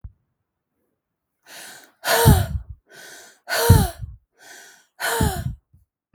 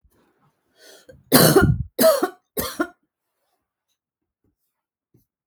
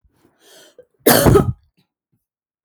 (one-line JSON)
{"exhalation_length": "6.1 s", "exhalation_amplitude": 32768, "exhalation_signal_mean_std_ratio": 0.36, "three_cough_length": "5.5 s", "three_cough_amplitude": 32768, "three_cough_signal_mean_std_ratio": 0.32, "cough_length": "2.6 s", "cough_amplitude": 32766, "cough_signal_mean_std_ratio": 0.33, "survey_phase": "beta (2021-08-13 to 2022-03-07)", "age": "45-64", "gender": "Female", "wearing_mask": "No", "symptom_none": true, "smoker_status": "Ex-smoker", "respiratory_condition_asthma": false, "respiratory_condition_other": false, "recruitment_source": "REACT", "submission_delay": "0 days", "covid_test_result": "Negative", "covid_test_method": "RT-qPCR"}